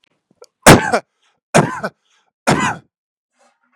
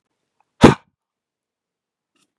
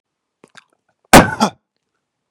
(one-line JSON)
{"three_cough_length": "3.8 s", "three_cough_amplitude": 32768, "three_cough_signal_mean_std_ratio": 0.31, "exhalation_length": "2.4 s", "exhalation_amplitude": 32768, "exhalation_signal_mean_std_ratio": 0.16, "cough_length": "2.3 s", "cough_amplitude": 32768, "cough_signal_mean_std_ratio": 0.24, "survey_phase": "beta (2021-08-13 to 2022-03-07)", "age": "45-64", "gender": "Male", "wearing_mask": "No", "symptom_none": true, "smoker_status": "Never smoked", "respiratory_condition_asthma": false, "respiratory_condition_other": false, "recruitment_source": "REACT", "submission_delay": "3 days", "covid_test_result": "Negative", "covid_test_method": "RT-qPCR", "influenza_a_test_result": "Unknown/Void", "influenza_b_test_result": "Unknown/Void"}